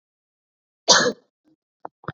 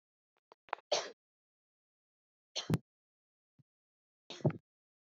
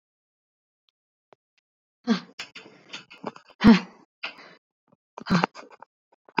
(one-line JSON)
{"cough_length": "2.1 s", "cough_amplitude": 30778, "cough_signal_mean_std_ratio": 0.26, "three_cough_length": "5.1 s", "three_cough_amplitude": 4721, "three_cough_signal_mean_std_ratio": 0.21, "exhalation_length": "6.4 s", "exhalation_amplitude": 27137, "exhalation_signal_mean_std_ratio": 0.22, "survey_phase": "beta (2021-08-13 to 2022-03-07)", "age": "18-44", "gender": "Female", "wearing_mask": "No", "symptom_none": true, "smoker_status": "Never smoked", "respiratory_condition_asthma": false, "respiratory_condition_other": false, "recruitment_source": "REACT", "submission_delay": "3 days", "covid_test_result": "Negative", "covid_test_method": "RT-qPCR"}